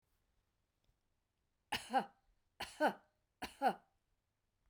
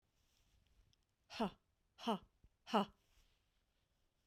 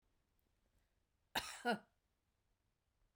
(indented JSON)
{
  "three_cough_length": "4.7 s",
  "three_cough_amplitude": 2608,
  "three_cough_signal_mean_std_ratio": 0.27,
  "exhalation_length": "4.3 s",
  "exhalation_amplitude": 2335,
  "exhalation_signal_mean_std_ratio": 0.25,
  "cough_length": "3.2 s",
  "cough_amplitude": 1952,
  "cough_signal_mean_std_ratio": 0.24,
  "survey_phase": "beta (2021-08-13 to 2022-03-07)",
  "age": "45-64",
  "gender": "Female",
  "wearing_mask": "No",
  "symptom_none": true,
  "smoker_status": "Ex-smoker",
  "respiratory_condition_asthma": true,
  "respiratory_condition_other": false,
  "recruitment_source": "REACT",
  "submission_delay": "2 days",
  "covid_test_result": "Negative",
  "covid_test_method": "RT-qPCR"
}